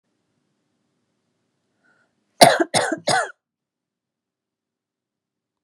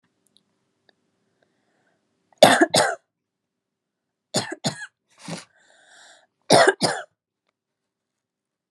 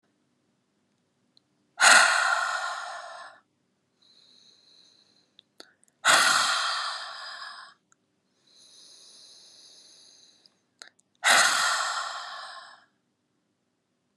{"cough_length": "5.6 s", "cough_amplitude": 32768, "cough_signal_mean_std_ratio": 0.22, "three_cough_length": "8.7 s", "three_cough_amplitude": 32768, "three_cough_signal_mean_std_ratio": 0.25, "exhalation_length": "14.2 s", "exhalation_amplitude": 22985, "exhalation_signal_mean_std_ratio": 0.36, "survey_phase": "beta (2021-08-13 to 2022-03-07)", "age": "18-44", "gender": "Female", "wearing_mask": "No", "symptom_runny_or_blocked_nose": true, "symptom_shortness_of_breath": true, "smoker_status": "Never smoked", "respiratory_condition_asthma": false, "respiratory_condition_other": false, "recruitment_source": "Test and Trace", "submission_delay": "2 days", "covid_test_result": "Positive", "covid_test_method": "ePCR"}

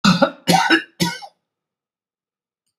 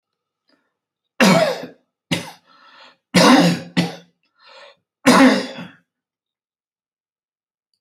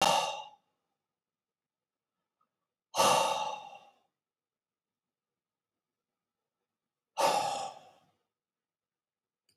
{"cough_length": "2.8 s", "cough_amplitude": 31955, "cough_signal_mean_std_ratio": 0.4, "three_cough_length": "7.8 s", "three_cough_amplitude": 29568, "three_cough_signal_mean_std_ratio": 0.35, "exhalation_length": "9.6 s", "exhalation_amplitude": 7462, "exhalation_signal_mean_std_ratio": 0.31, "survey_phase": "alpha (2021-03-01 to 2021-08-12)", "age": "65+", "gender": "Male", "wearing_mask": "No", "symptom_none": true, "smoker_status": "Ex-smoker", "respiratory_condition_asthma": false, "respiratory_condition_other": false, "recruitment_source": "REACT", "submission_delay": "2 days", "covid_test_result": "Negative", "covid_test_method": "RT-qPCR"}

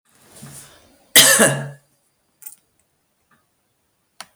{"cough_length": "4.4 s", "cough_amplitude": 32768, "cough_signal_mean_std_ratio": 0.27, "survey_phase": "beta (2021-08-13 to 2022-03-07)", "age": "45-64", "gender": "Female", "wearing_mask": "No", "symptom_sore_throat": true, "symptom_onset": "13 days", "smoker_status": "Never smoked", "respiratory_condition_asthma": false, "respiratory_condition_other": false, "recruitment_source": "REACT", "submission_delay": "6 days", "covid_test_result": "Negative", "covid_test_method": "RT-qPCR", "influenza_a_test_result": "Negative", "influenza_b_test_result": "Negative"}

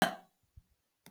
{"cough_length": "1.1 s", "cough_amplitude": 8044, "cough_signal_mean_std_ratio": 0.23, "survey_phase": "beta (2021-08-13 to 2022-03-07)", "age": "45-64", "gender": "Female", "wearing_mask": "No", "symptom_none": true, "smoker_status": "Never smoked", "respiratory_condition_asthma": false, "respiratory_condition_other": false, "recruitment_source": "REACT", "submission_delay": "1 day", "covid_test_result": "Negative", "covid_test_method": "RT-qPCR", "influenza_a_test_result": "Unknown/Void", "influenza_b_test_result": "Unknown/Void"}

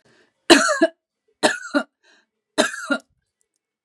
{"three_cough_length": "3.8 s", "three_cough_amplitude": 32768, "three_cough_signal_mean_std_ratio": 0.33, "survey_phase": "beta (2021-08-13 to 2022-03-07)", "age": "45-64", "gender": "Female", "wearing_mask": "No", "symptom_none": true, "smoker_status": "Never smoked", "respiratory_condition_asthma": true, "respiratory_condition_other": false, "recruitment_source": "REACT", "submission_delay": "1 day", "covid_test_result": "Negative", "covid_test_method": "RT-qPCR", "influenza_a_test_result": "Negative", "influenza_b_test_result": "Negative"}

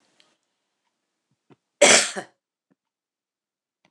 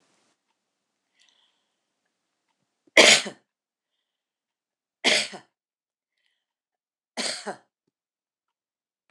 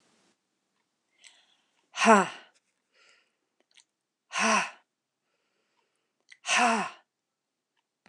{"cough_length": "3.9 s", "cough_amplitude": 26027, "cough_signal_mean_std_ratio": 0.21, "three_cough_length": "9.1 s", "three_cough_amplitude": 26028, "three_cough_signal_mean_std_ratio": 0.18, "exhalation_length": "8.1 s", "exhalation_amplitude": 17750, "exhalation_signal_mean_std_ratio": 0.27, "survey_phase": "beta (2021-08-13 to 2022-03-07)", "age": "65+", "gender": "Female", "wearing_mask": "No", "symptom_none": true, "smoker_status": "Never smoked", "respiratory_condition_asthma": false, "respiratory_condition_other": false, "recruitment_source": "REACT", "submission_delay": "1 day", "covid_test_result": "Negative", "covid_test_method": "RT-qPCR"}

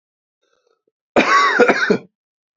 {"cough_length": "2.6 s", "cough_amplitude": 30288, "cough_signal_mean_std_ratio": 0.46, "survey_phase": "beta (2021-08-13 to 2022-03-07)", "age": "18-44", "gender": "Male", "wearing_mask": "No", "symptom_runny_or_blocked_nose": true, "symptom_fatigue": true, "symptom_headache": true, "symptom_onset": "3 days", "smoker_status": "Never smoked", "respiratory_condition_asthma": false, "respiratory_condition_other": false, "recruitment_source": "Test and Trace", "submission_delay": "2 days", "covid_test_result": "Positive", "covid_test_method": "ePCR"}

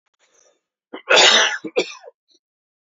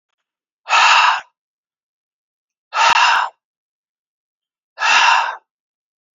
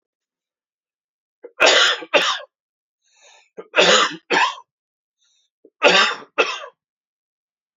{"cough_length": "3.0 s", "cough_amplitude": 32767, "cough_signal_mean_std_ratio": 0.35, "exhalation_length": "6.1 s", "exhalation_amplitude": 30165, "exhalation_signal_mean_std_ratio": 0.42, "three_cough_length": "7.8 s", "three_cough_amplitude": 30216, "three_cough_signal_mean_std_ratio": 0.37, "survey_phase": "beta (2021-08-13 to 2022-03-07)", "age": "45-64", "gender": "Male", "wearing_mask": "No", "symptom_runny_or_blocked_nose": true, "symptom_other": true, "symptom_onset": "3 days", "smoker_status": "Never smoked", "respiratory_condition_asthma": false, "respiratory_condition_other": false, "recruitment_source": "Test and Trace", "submission_delay": "2 days", "covid_test_result": "Positive", "covid_test_method": "RT-qPCR", "covid_ct_value": 12.5, "covid_ct_gene": "ORF1ab gene", "covid_ct_mean": 12.7, "covid_viral_load": "66000000 copies/ml", "covid_viral_load_category": "High viral load (>1M copies/ml)"}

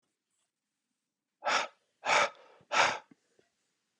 {"exhalation_length": "4.0 s", "exhalation_amplitude": 7197, "exhalation_signal_mean_std_ratio": 0.33, "survey_phase": "beta (2021-08-13 to 2022-03-07)", "age": "18-44", "gender": "Male", "wearing_mask": "No", "symptom_cough_any": true, "symptom_new_continuous_cough": true, "symptom_runny_or_blocked_nose": true, "symptom_onset": "3 days", "smoker_status": "Ex-smoker", "respiratory_condition_asthma": true, "respiratory_condition_other": false, "recruitment_source": "Test and Trace", "submission_delay": "2 days", "covid_test_result": "Positive", "covid_test_method": "RT-qPCR", "covid_ct_value": 19.9, "covid_ct_gene": "N gene", "covid_ct_mean": 20.1, "covid_viral_load": "250000 copies/ml", "covid_viral_load_category": "Low viral load (10K-1M copies/ml)"}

